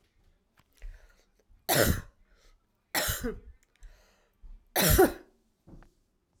{"three_cough_length": "6.4 s", "three_cough_amplitude": 12163, "three_cough_signal_mean_std_ratio": 0.33, "survey_phase": "alpha (2021-03-01 to 2021-08-12)", "age": "18-44", "gender": "Male", "wearing_mask": "No", "symptom_fatigue": true, "symptom_headache": true, "symptom_change_to_sense_of_smell_or_taste": true, "symptom_loss_of_taste": true, "symptom_onset": "5 days", "smoker_status": "Never smoked", "respiratory_condition_asthma": false, "respiratory_condition_other": false, "recruitment_source": "Test and Trace", "submission_delay": "1 day", "covid_test_result": "Positive", "covid_test_method": "RT-qPCR"}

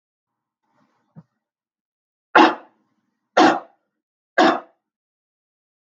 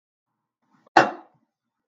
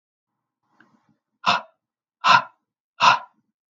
{"three_cough_length": "6.0 s", "three_cough_amplitude": 32768, "three_cough_signal_mean_std_ratio": 0.24, "cough_length": "1.9 s", "cough_amplitude": 32768, "cough_signal_mean_std_ratio": 0.18, "exhalation_length": "3.8 s", "exhalation_amplitude": 31280, "exhalation_signal_mean_std_ratio": 0.27, "survey_phase": "beta (2021-08-13 to 2022-03-07)", "age": "45-64", "gender": "Female", "wearing_mask": "No", "symptom_none": true, "smoker_status": "Never smoked", "respiratory_condition_asthma": false, "respiratory_condition_other": false, "recruitment_source": "REACT", "submission_delay": "1 day", "covid_test_result": "Negative", "covid_test_method": "RT-qPCR", "influenza_a_test_result": "Unknown/Void", "influenza_b_test_result": "Unknown/Void"}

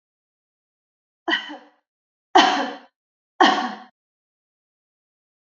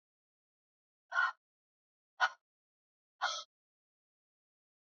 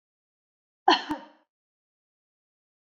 {"three_cough_length": "5.5 s", "three_cough_amplitude": 29380, "three_cough_signal_mean_std_ratio": 0.28, "exhalation_length": "4.9 s", "exhalation_amplitude": 4291, "exhalation_signal_mean_std_ratio": 0.22, "cough_length": "2.8 s", "cough_amplitude": 16513, "cough_signal_mean_std_ratio": 0.19, "survey_phase": "beta (2021-08-13 to 2022-03-07)", "age": "45-64", "gender": "Female", "wearing_mask": "No", "symptom_none": true, "smoker_status": "Ex-smoker", "respiratory_condition_asthma": false, "respiratory_condition_other": false, "recruitment_source": "REACT", "submission_delay": "1 day", "covid_test_result": "Negative", "covid_test_method": "RT-qPCR", "influenza_a_test_result": "Negative", "influenza_b_test_result": "Negative"}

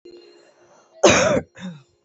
{"cough_length": "2.0 s", "cough_amplitude": 28856, "cough_signal_mean_std_ratio": 0.39, "survey_phase": "beta (2021-08-13 to 2022-03-07)", "age": "18-44", "gender": "Female", "wearing_mask": "No", "symptom_shortness_of_breath": true, "symptom_sore_throat": true, "symptom_headache": true, "symptom_change_to_sense_of_smell_or_taste": true, "symptom_onset": "8 days", "smoker_status": "Current smoker (1 to 10 cigarettes per day)", "respiratory_condition_asthma": true, "respiratory_condition_other": false, "recruitment_source": "REACT", "submission_delay": "0 days", "covid_test_result": "Negative", "covid_test_method": "RT-qPCR"}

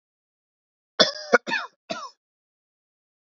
{"three_cough_length": "3.3 s", "three_cough_amplitude": 27180, "three_cough_signal_mean_std_ratio": 0.23, "survey_phase": "beta (2021-08-13 to 2022-03-07)", "age": "18-44", "gender": "Male", "wearing_mask": "No", "symptom_cough_any": true, "symptom_runny_or_blocked_nose": true, "symptom_sore_throat": true, "symptom_fatigue": true, "smoker_status": "Never smoked", "respiratory_condition_asthma": false, "respiratory_condition_other": false, "recruitment_source": "Test and Trace", "submission_delay": "1 day", "covid_test_result": "Negative", "covid_test_method": "LFT"}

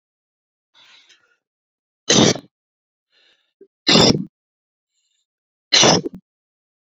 {"three_cough_length": "6.9 s", "three_cough_amplitude": 32617, "three_cough_signal_mean_std_ratio": 0.29, "survey_phase": "beta (2021-08-13 to 2022-03-07)", "age": "18-44", "gender": "Male", "wearing_mask": "No", "symptom_none": true, "smoker_status": "Ex-smoker", "respiratory_condition_asthma": false, "respiratory_condition_other": false, "recruitment_source": "REACT", "submission_delay": "2 days", "covid_test_result": "Negative", "covid_test_method": "RT-qPCR"}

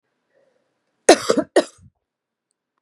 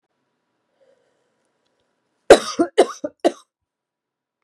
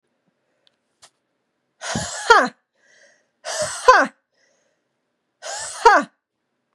{"cough_length": "2.8 s", "cough_amplitude": 32768, "cough_signal_mean_std_ratio": 0.22, "three_cough_length": "4.4 s", "three_cough_amplitude": 32768, "three_cough_signal_mean_std_ratio": 0.19, "exhalation_length": "6.7 s", "exhalation_amplitude": 32767, "exhalation_signal_mean_std_ratio": 0.28, "survey_phase": "beta (2021-08-13 to 2022-03-07)", "age": "18-44", "gender": "Female", "wearing_mask": "No", "symptom_cough_any": true, "symptom_runny_or_blocked_nose": true, "symptom_other": true, "symptom_onset": "2 days", "smoker_status": "Ex-smoker", "respiratory_condition_asthma": false, "respiratory_condition_other": false, "recruitment_source": "Test and Trace", "submission_delay": "2 days", "covid_test_result": "Positive", "covid_test_method": "RT-qPCR", "covid_ct_value": 31.8, "covid_ct_gene": "ORF1ab gene"}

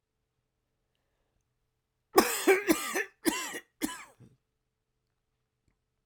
{"cough_length": "6.1 s", "cough_amplitude": 21963, "cough_signal_mean_std_ratio": 0.29, "survey_phase": "beta (2021-08-13 to 2022-03-07)", "age": "18-44", "gender": "Male", "wearing_mask": "No", "symptom_cough_any": true, "symptom_runny_or_blocked_nose": true, "symptom_shortness_of_breath": true, "symptom_sore_throat": true, "symptom_fatigue": true, "symptom_headache": true, "symptom_loss_of_taste": true, "symptom_other": true, "smoker_status": "Ex-smoker", "respiratory_condition_asthma": false, "respiratory_condition_other": false, "recruitment_source": "Test and Trace", "submission_delay": "1 day", "covid_test_result": "Positive", "covid_test_method": "RT-qPCR", "covid_ct_value": 20.3, "covid_ct_gene": "ORF1ab gene"}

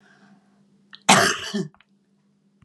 {"cough_length": "2.6 s", "cough_amplitude": 31327, "cough_signal_mean_std_ratio": 0.31, "survey_phase": "alpha (2021-03-01 to 2021-08-12)", "age": "65+", "gender": "Female", "wearing_mask": "No", "symptom_none": true, "smoker_status": "Never smoked", "respiratory_condition_asthma": false, "respiratory_condition_other": false, "recruitment_source": "REACT", "submission_delay": "2 days", "covid_test_result": "Negative", "covid_test_method": "RT-qPCR"}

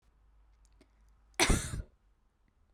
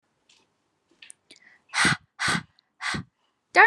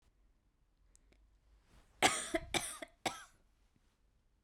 {"cough_length": "2.7 s", "cough_amplitude": 7648, "cough_signal_mean_std_ratio": 0.29, "exhalation_length": "3.7 s", "exhalation_amplitude": 26668, "exhalation_signal_mean_std_ratio": 0.3, "three_cough_length": "4.4 s", "three_cough_amplitude": 6221, "three_cough_signal_mean_std_ratio": 0.28, "survey_phase": "beta (2021-08-13 to 2022-03-07)", "age": "18-44", "gender": "Female", "wearing_mask": "No", "symptom_runny_or_blocked_nose": true, "symptom_sore_throat": true, "symptom_fatigue": true, "symptom_headache": true, "symptom_other": true, "symptom_onset": "6 days", "smoker_status": "Never smoked", "respiratory_condition_asthma": false, "respiratory_condition_other": false, "recruitment_source": "Test and Trace", "submission_delay": "2 days", "covid_test_result": "Positive", "covid_test_method": "RT-qPCR", "covid_ct_value": 13.1, "covid_ct_gene": "ORF1ab gene"}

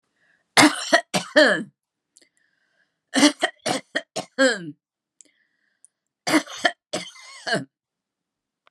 {"three_cough_length": "8.7 s", "three_cough_amplitude": 32768, "three_cough_signal_mean_std_ratio": 0.33, "survey_phase": "beta (2021-08-13 to 2022-03-07)", "age": "65+", "gender": "Female", "wearing_mask": "No", "symptom_none": true, "smoker_status": "Never smoked", "respiratory_condition_asthma": false, "respiratory_condition_other": false, "recruitment_source": "REACT", "submission_delay": "2 days", "covid_test_result": "Negative", "covid_test_method": "RT-qPCR", "influenza_a_test_result": "Negative", "influenza_b_test_result": "Negative"}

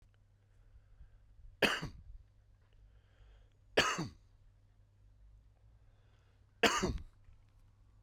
{"three_cough_length": "8.0 s", "three_cough_amplitude": 5867, "three_cough_signal_mean_std_ratio": 0.3, "survey_phase": "beta (2021-08-13 to 2022-03-07)", "age": "18-44", "gender": "Male", "wearing_mask": "No", "symptom_none": true, "smoker_status": "Ex-smoker", "respiratory_condition_asthma": false, "respiratory_condition_other": false, "recruitment_source": "REACT", "submission_delay": "3 days", "covid_test_result": "Negative", "covid_test_method": "RT-qPCR"}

